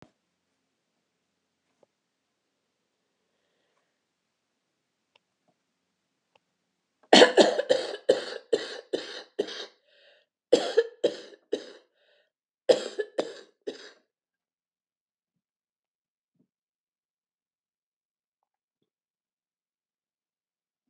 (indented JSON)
{
  "three_cough_length": "20.9 s",
  "three_cough_amplitude": 27317,
  "three_cough_signal_mean_std_ratio": 0.19,
  "survey_phase": "alpha (2021-03-01 to 2021-08-12)",
  "age": "65+",
  "gender": "Female",
  "wearing_mask": "No",
  "symptom_cough_any": true,
  "symptom_onset": "13 days",
  "smoker_status": "Never smoked",
  "respiratory_condition_asthma": false,
  "respiratory_condition_other": true,
  "recruitment_source": "REACT",
  "submission_delay": "2 days",
  "covid_test_result": "Negative",
  "covid_test_method": "RT-qPCR"
}